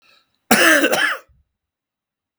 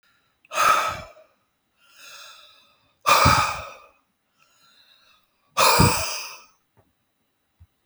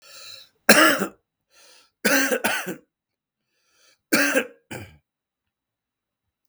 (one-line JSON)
{"cough_length": "2.4 s", "cough_amplitude": 32768, "cough_signal_mean_std_ratio": 0.42, "exhalation_length": "7.9 s", "exhalation_amplitude": 26939, "exhalation_signal_mean_std_ratio": 0.36, "three_cough_length": "6.5 s", "three_cough_amplitude": 32768, "three_cough_signal_mean_std_ratio": 0.34, "survey_phase": "beta (2021-08-13 to 2022-03-07)", "age": "45-64", "gender": "Male", "wearing_mask": "No", "symptom_cough_any": true, "symptom_runny_or_blocked_nose": true, "symptom_sore_throat": true, "symptom_fatigue": true, "symptom_fever_high_temperature": true, "symptom_headache": true, "symptom_other": true, "smoker_status": "Ex-smoker", "respiratory_condition_asthma": false, "respiratory_condition_other": false, "recruitment_source": "Test and Trace", "submission_delay": "0 days", "covid_test_result": "Positive", "covid_test_method": "LFT"}